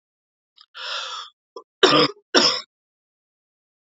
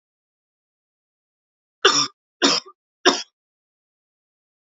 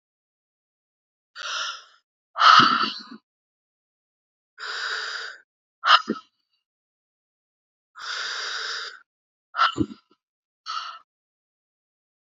{
  "cough_length": "3.8 s",
  "cough_amplitude": 28623,
  "cough_signal_mean_std_ratio": 0.33,
  "three_cough_length": "4.7 s",
  "three_cough_amplitude": 29517,
  "three_cough_signal_mean_std_ratio": 0.25,
  "exhalation_length": "12.2 s",
  "exhalation_amplitude": 30943,
  "exhalation_signal_mean_std_ratio": 0.3,
  "survey_phase": "alpha (2021-03-01 to 2021-08-12)",
  "age": "18-44",
  "gender": "Female",
  "wearing_mask": "No",
  "symptom_headache": true,
  "symptom_change_to_sense_of_smell_or_taste": true,
  "symptom_loss_of_taste": true,
  "symptom_onset": "4 days",
  "smoker_status": "Never smoked",
  "respiratory_condition_asthma": false,
  "respiratory_condition_other": false,
  "recruitment_source": "Test and Trace",
  "submission_delay": "1 day",
  "covid_test_result": "Positive",
  "covid_test_method": "RT-qPCR",
  "covid_ct_value": 16.8,
  "covid_ct_gene": "ORF1ab gene",
  "covid_ct_mean": 17.3,
  "covid_viral_load": "2100000 copies/ml",
  "covid_viral_load_category": "High viral load (>1M copies/ml)"
}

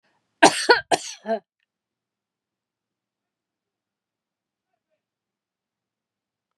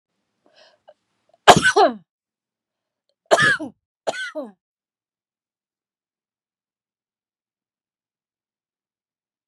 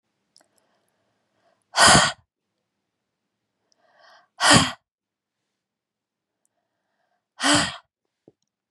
{
  "cough_length": "6.6 s",
  "cough_amplitude": 32754,
  "cough_signal_mean_std_ratio": 0.18,
  "three_cough_length": "9.5 s",
  "three_cough_amplitude": 32768,
  "three_cough_signal_mean_std_ratio": 0.21,
  "exhalation_length": "8.7 s",
  "exhalation_amplitude": 28500,
  "exhalation_signal_mean_std_ratio": 0.25,
  "survey_phase": "beta (2021-08-13 to 2022-03-07)",
  "age": "45-64",
  "gender": "Female",
  "wearing_mask": "No",
  "symptom_none": true,
  "symptom_onset": "12 days",
  "smoker_status": "Ex-smoker",
  "respiratory_condition_asthma": false,
  "respiratory_condition_other": false,
  "recruitment_source": "REACT",
  "submission_delay": "14 days",
  "covid_test_result": "Negative",
  "covid_test_method": "RT-qPCR",
  "influenza_a_test_result": "Negative",
  "influenza_b_test_result": "Negative"
}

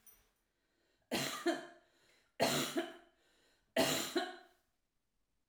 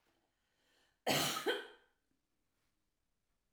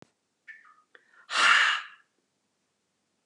{
  "three_cough_length": "5.5 s",
  "three_cough_amplitude": 3201,
  "three_cough_signal_mean_std_ratio": 0.42,
  "cough_length": "3.5 s",
  "cough_amplitude": 3023,
  "cough_signal_mean_std_ratio": 0.32,
  "exhalation_length": "3.3 s",
  "exhalation_amplitude": 11836,
  "exhalation_signal_mean_std_ratio": 0.32,
  "survey_phase": "alpha (2021-03-01 to 2021-08-12)",
  "age": "65+",
  "gender": "Female",
  "wearing_mask": "No",
  "symptom_none": true,
  "smoker_status": "Ex-smoker",
  "respiratory_condition_asthma": false,
  "respiratory_condition_other": false,
  "recruitment_source": "REACT",
  "submission_delay": "1 day",
  "covid_test_result": "Negative",
  "covid_test_method": "RT-qPCR"
}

